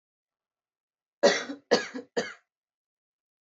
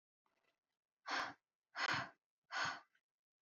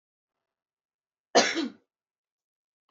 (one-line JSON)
{"three_cough_length": "3.4 s", "three_cough_amplitude": 14857, "three_cough_signal_mean_std_ratio": 0.27, "exhalation_length": "3.4 s", "exhalation_amplitude": 1550, "exhalation_signal_mean_std_ratio": 0.39, "cough_length": "2.9 s", "cough_amplitude": 15517, "cough_signal_mean_std_ratio": 0.23, "survey_phase": "beta (2021-08-13 to 2022-03-07)", "age": "18-44", "gender": "Female", "wearing_mask": "No", "symptom_none": true, "smoker_status": "Never smoked", "respiratory_condition_asthma": false, "respiratory_condition_other": false, "recruitment_source": "REACT", "submission_delay": "1 day", "covid_test_result": "Negative", "covid_test_method": "RT-qPCR", "influenza_a_test_result": "Negative", "influenza_b_test_result": "Negative"}